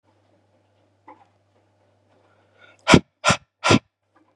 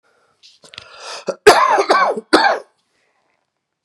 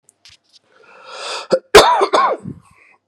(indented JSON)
{
  "exhalation_length": "4.4 s",
  "exhalation_amplitude": 32768,
  "exhalation_signal_mean_std_ratio": 0.22,
  "three_cough_length": "3.8 s",
  "three_cough_amplitude": 32768,
  "three_cough_signal_mean_std_ratio": 0.41,
  "cough_length": "3.1 s",
  "cough_amplitude": 32768,
  "cough_signal_mean_std_ratio": 0.39,
  "survey_phase": "beta (2021-08-13 to 2022-03-07)",
  "age": "45-64",
  "gender": "Male",
  "wearing_mask": "No",
  "symptom_cough_any": true,
  "symptom_new_continuous_cough": true,
  "symptom_runny_or_blocked_nose": true,
  "symptom_shortness_of_breath": true,
  "symptom_headache": true,
  "symptom_change_to_sense_of_smell_or_taste": true,
  "symptom_onset": "3 days",
  "smoker_status": "Ex-smoker",
  "respiratory_condition_asthma": false,
  "respiratory_condition_other": false,
  "recruitment_source": "Test and Trace",
  "submission_delay": "2 days",
  "covid_test_result": "Positive",
  "covid_test_method": "RT-qPCR",
  "covid_ct_value": 26.0,
  "covid_ct_gene": "ORF1ab gene"
}